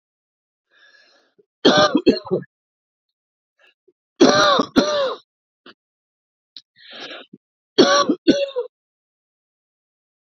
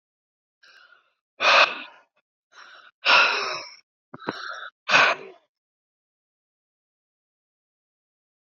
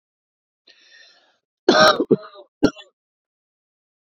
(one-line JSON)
{"three_cough_length": "10.2 s", "three_cough_amplitude": 29538, "three_cough_signal_mean_std_ratio": 0.34, "exhalation_length": "8.4 s", "exhalation_amplitude": 21658, "exhalation_signal_mean_std_ratio": 0.3, "cough_length": "4.2 s", "cough_amplitude": 27530, "cough_signal_mean_std_ratio": 0.26, "survey_phase": "beta (2021-08-13 to 2022-03-07)", "age": "45-64", "gender": "Male", "wearing_mask": "No", "symptom_none": true, "smoker_status": "Current smoker (1 to 10 cigarettes per day)", "respiratory_condition_asthma": false, "respiratory_condition_other": true, "recruitment_source": "Test and Trace", "submission_delay": "2 days", "covid_test_result": "Positive", "covid_test_method": "ePCR"}